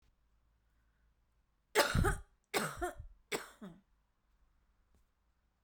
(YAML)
three_cough_length: 5.6 s
three_cough_amplitude: 8039
three_cough_signal_mean_std_ratio: 0.31
survey_phase: beta (2021-08-13 to 2022-03-07)
age: 45-64
gender: Female
wearing_mask: 'No'
symptom_none: true
smoker_status: Ex-smoker
respiratory_condition_asthma: false
respiratory_condition_other: false
recruitment_source: REACT
submission_delay: 4 days
covid_test_result: Negative
covid_test_method: RT-qPCR